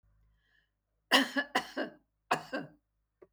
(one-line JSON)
{"cough_length": "3.3 s", "cough_amplitude": 10718, "cough_signal_mean_std_ratio": 0.32, "survey_phase": "beta (2021-08-13 to 2022-03-07)", "age": "65+", "gender": "Female", "wearing_mask": "No", "symptom_none": true, "smoker_status": "Never smoked", "respiratory_condition_asthma": false, "respiratory_condition_other": false, "recruitment_source": "Test and Trace", "submission_delay": "0 days", "covid_test_result": "Negative", "covid_test_method": "LFT"}